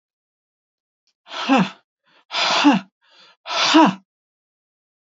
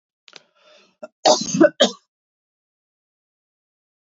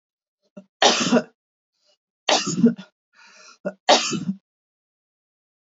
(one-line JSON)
{"exhalation_length": "5.0 s", "exhalation_amplitude": 25286, "exhalation_signal_mean_std_ratio": 0.38, "cough_length": "4.0 s", "cough_amplitude": 30625, "cough_signal_mean_std_ratio": 0.25, "three_cough_length": "5.6 s", "three_cough_amplitude": 28321, "three_cough_signal_mean_std_ratio": 0.35, "survey_phase": "beta (2021-08-13 to 2022-03-07)", "age": "45-64", "gender": "Female", "wearing_mask": "No", "symptom_sore_throat": true, "symptom_fatigue": true, "symptom_headache": true, "smoker_status": "Never smoked", "respiratory_condition_asthma": false, "respiratory_condition_other": false, "recruitment_source": "Test and Trace", "submission_delay": "1 day", "covid_test_result": "Positive", "covid_test_method": "LFT"}